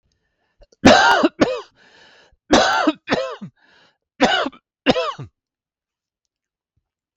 {
  "three_cough_length": "7.2 s",
  "three_cough_amplitude": 32767,
  "three_cough_signal_mean_std_ratio": 0.38,
  "survey_phase": "beta (2021-08-13 to 2022-03-07)",
  "age": "45-64",
  "gender": "Male",
  "wearing_mask": "No",
  "symptom_none": true,
  "symptom_onset": "2 days",
  "smoker_status": "Never smoked",
  "respiratory_condition_asthma": false,
  "respiratory_condition_other": false,
  "recruitment_source": "Test and Trace",
  "submission_delay": "1 day",
  "covid_test_result": "Negative",
  "covid_test_method": "RT-qPCR"
}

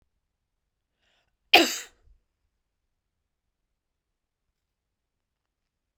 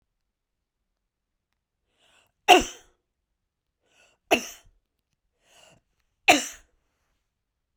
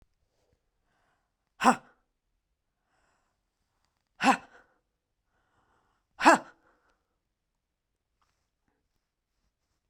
{
  "cough_length": "6.0 s",
  "cough_amplitude": 32768,
  "cough_signal_mean_std_ratio": 0.13,
  "three_cough_length": "7.8 s",
  "three_cough_amplitude": 28137,
  "three_cough_signal_mean_std_ratio": 0.17,
  "exhalation_length": "9.9 s",
  "exhalation_amplitude": 23141,
  "exhalation_signal_mean_std_ratio": 0.16,
  "survey_phase": "beta (2021-08-13 to 2022-03-07)",
  "age": "45-64",
  "gender": "Female",
  "wearing_mask": "No",
  "symptom_none": true,
  "smoker_status": "Ex-smoker",
  "respiratory_condition_asthma": false,
  "respiratory_condition_other": false,
  "recruitment_source": "REACT",
  "submission_delay": "8 days",
  "covid_test_result": "Negative",
  "covid_test_method": "RT-qPCR"
}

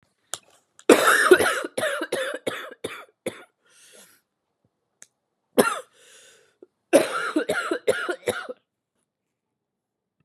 {
  "cough_length": "10.2 s",
  "cough_amplitude": 30938,
  "cough_signal_mean_std_ratio": 0.35,
  "survey_phase": "beta (2021-08-13 to 2022-03-07)",
  "age": "45-64",
  "gender": "Female",
  "wearing_mask": "No",
  "symptom_cough_any": true,
  "symptom_new_continuous_cough": true,
  "symptom_runny_or_blocked_nose": true,
  "symptom_sore_throat": true,
  "symptom_abdominal_pain": true,
  "symptom_fatigue": true,
  "symptom_fever_high_temperature": true,
  "symptom_headache": true,
  "smoker_status": "Never smoked",
  "respiratory_condition_asthma": false,
  "respiratory_condition_other": false,
  "recruitment_source": "Test and Trace",
  "submission_delay": "2 days",
  "covid_test_result": "Positive",
  "covid_test_method": "LFT"
}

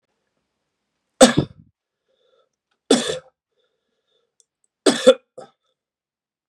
{
  "three_cough_length": "6.5 s",
  "three_cough_amplitude": 32768,
  "three_cough_signal_mean_std_ratio": 0.21,
  "survey_phase": "beta (2021-08-13 to 2022-03-07)",
  "age": "18-44",
  "gender": "Male",
  "wearing_mask": "No",
  "symptom_cough_any": true,
  "symptom_runny_or_blocked_nose": true,
  "symptom_sore_throat": true,
  "symptom_onset": "3 days",
  "smoker_status": "Never smoked",
  "respiratory_condition_asthma": false,
  "respiratory_condition_other": false,
  "recruitment_source": "Test and Trace",
  "submission_delay": "1 day",
  "covid_test_result": "Positive",
  "covid_test_method": "ePCR"
}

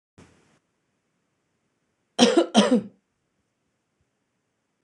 {
  "cough_length": "4.8 s",
  "cough_amplitude": 25637,
  "cough_signal_mean_std_ratio": 0.26,
  "survey_phase": "beta (2021-08-13 to 2022-03-07)",
  "age": "45-64",
  "gender": "Female",
  "wearing_mask": "No",
  "symptom_none": true,
  "smoker_status": "Ex-smoker",
  "respiratory_condition_asthma": false,
  "respiratory_condition_other": false,
  "recruitment_source": "REACT",
  "submission_delay": "1 day",
  "covid_test_result": "Negative",
  "covid_test_method": "RT-qPCR",
  "influenza_a_test_result": "Negative",
  "influenza_b_test_result": "Negative"
}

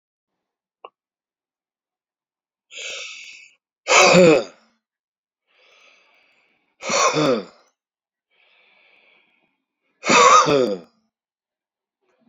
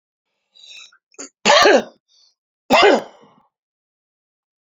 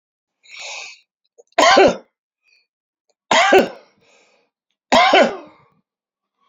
{
  "exhalation_length": "12.3 s",
  "exhalation_amplitude": 28497,
  "exhalation_signal_mean_std_ratio": 0.31,
  "cough_length": "4.6 s",
  "cough_amplitude": 30803,
  "cough_signal_mean_std_ratio": 0.32,
  "three_cough_length": "6.5 s",
  "three_cough_amplitude": 32767,
  "three_cough_signal_mean_std_ratio": 0.35,
  "survey_phase": "alpha (2021-03-01 to 2021-08-12)",
  "age": "65+",
  "gender": "Male",
  "wearing_mask": "No",
  "symptom_cough_any": true,
  "symptom_abdominal_pain": true,
  "symptom_fatigue": true,
  "symptom_loss_of_taste": true,
  "symptom_onset": "4 days",
  "smoker_status": "Never smoked",
  "respiratory_condition_asthma": false,
  "respiratory_condition_other": false,
  "recruitment_source": "Test and Trace",
  "submission_delay": "1 day",
  "covid_test_result": "Positive",
  "covid_test_method": "RT-qPCR",
  "covid_ct_value": 14.1,
  "covid_ct_gene": "ORF1ab gene",
  "covid_ct_mean": 15.0,
  "covid_viral_load": "12000000 copies/ml",
  "covid_viral_load_category": "High viral load (>1M copies/ml)"
}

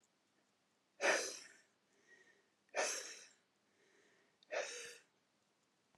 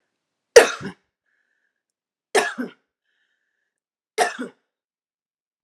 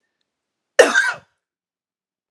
{
  "exhalation_length": "6.0 s",
  "exhalation_amplitude": 3525,
  "exhalation_signal_mean_std_ratio": 0.33,
  "three_cough_length": "5.6 s",
  "three_cough_amplitude": 32768,
  "three_cough_signal_mean_std_ratio": 0.2,
  "cough_length": "2.3 s",
  "cough_amplitude": 32768,
  "cough_signal_mean_std_ratio": 0.26,
  "survey_phase": "alpha (2021-03-01 to 2021-08-12)",
  "age": "45-64",
  "gender": "Female",
  "wearing_mask": "No",
  "symptom_none": true,
  "smoker_status": "Current smoker (1 to 10 cigarettes per day)",
  "respiratory_condition_asthma": false,
  "respiratory_condition_other": false,
  "recruitment_source": "REACT",
  "submission_delay": "2 days",
  "covid_test_result": "Negative",
  "covid_test_method": "RT-qPCR"
}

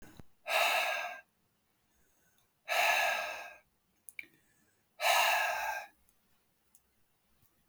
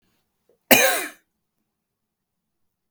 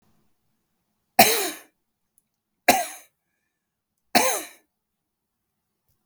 {
  "exhalation_length": "7.7 s",
  "exhalation_amplitude": 5451,
  "exhalation_signal_mean_std_ratio": 0.45,
  "cough_length": "2.9 s",
  "cough_amplitude": 32768,
  "cough_signal_mean_std_ratio": 0.24,
  "three_cough_length": "6.1 s",
  "three_cough_amplitude": 32768,
  "three_cough_signal_mean_std_ratio": 0.25,
  "survey_phase": "beta (2021-08-13 to 2022-03-07)",
  "age": "18-44",
  "gender": "Male",
  "wearing_mask": "No",
  "symptom_none": true,
  "smoker_status": "Never smoked",
  "respiratory_condition_asthma": false,
  "respiratory_condition_other": false,
  "recruitment_source": "REACT",
  "submission_delay": "1 day",
  "covid_test_result": "Negative",
  "covid_test_method": "RT-qPCR",
  "influenza_a_test_result": "Negative",
  "influenza_b_test_result": "Negative"
}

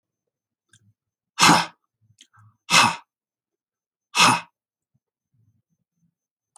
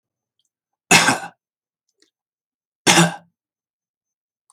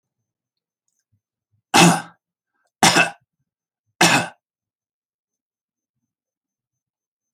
{
  "exhalation_length": "6.6 s",
  "exhalation_amplitude": 28338,
  "exhalation_signal_mean_std_ratio": 0.26,
  "cough_length": "4.5 s",
  "cough_amplitude": 32768,
  "cough_signal_mean_std_ratio": 0.26,
  "three_cough_length": "7.3 s",
  "three_cough_amplitude": 32768,
  "three_cough_signal_mean_std_ratio": 0.24,
  "survey_phase": "alpha (2021-03-01 to 2021-08-12)",
  "age": "65+",
  "gender": "Male",
  "wearing_mask": "No",
  "symptom_none": true,
  "smoker_status": "Never smoked",
  "respiratory_condition_asthma": false,
  "respiratory_condition_other": false,
  "recruitment_source": "REACT",
  "submission_delay": "1 day",
  "covid_test_result": "Negative",
  "covid_test_method": "RT-qPCR"
}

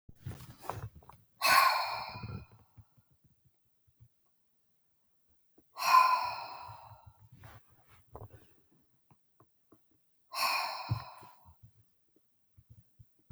{
  "exhalation_length": "13.3 s",
  "exhalation_amplitude": 9761,
  "exhalation_signal_mean_std_ratio": 0.32,
  "survey_phase": "beta (2021-08-13 to 2022-03-07)",
  "age": "65+",
  "gender": "Female",
  "wearing_mask": "No",
  "symptom_none": true,
  "smoker_status": "Ex-smoker",
  "respiratory_condition_asthma": false,
  "respiratory_condition_other": false,
  "recruitment_source": "REACT",
  "submission_delay": "3 days",
  "covid_test_result": "Negative",
  "covid_test_method": "RT-qPCR"
}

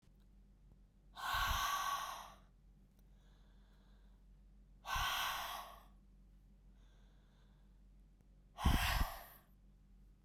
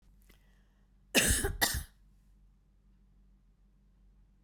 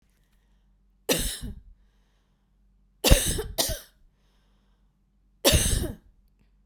{
  "exhalation_length": "10.2 s",
  "exhalation_amplitude": 3235,
  "exhalation_signal_mean_std_ratio": 0.45,
  "cough_length": "4.4 s",
  "cough_amplitude": 9666,
  "cough_signal_mean_std_ratio": 0.31,
  "three_cough_length": "6.7 s",
  "three_cough_amplitude": 32767,
  "three_cough_signal_mean_std_ratio": 0.33,
  "survey_phase": "beta (2021-08-13 to 2022-03-07)",
  "age": "45-64",
  "gender": "Female",
  "wearing_mask": "No",
  "symptom_cough_any": true,
  "symptom_headache": true,
  "symptom_onset": "6 days",
  "smoker_status": "Never smoked",
  "respiratory_condition_asthma": true,
  "respiratory_condition_other": false,
  "recruitment_source": "REACT",
  "submission_delay": "3 days",
  "covid_test_result": "Negative",
  "covid_test_method": "RT-qPCR"
}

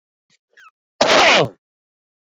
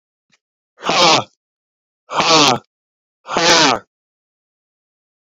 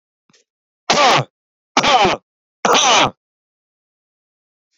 {
  "cough_length": "2.4 s",
  "cough_amplitude": 29493,
  "cough_signal_mean_std_ratio": 0.37,
  "exhalation_length": "5.4 s",
  "exhalation_amplitude": 32411,
  "exhalation_signal_mean_std_ratio": 0.39,
  "three_cough_length": "4.8 s",
  "three_cough_amplitude": 31549,
  "three_cough_signal_mean_std_ratio": 0.41,
  "survey_phase": "beta (2021-08-13 to 2022-03-07)",
  "age": "45-64",
  "gender": "Male",
  "wearing_mask": "No",
  "symptom_none": true,
  "smoker_status": "Current smoker (11 or more cigarettes per day)",
  "respiratory_condition_asthma": false,
  "respiratory_condition_other": false,
  "recruitment_source": "REACT",
  "submission_delay": "2 days",
  "covid_test_result": "Negative",
  "covid_test_method": "RT-qPCR"
}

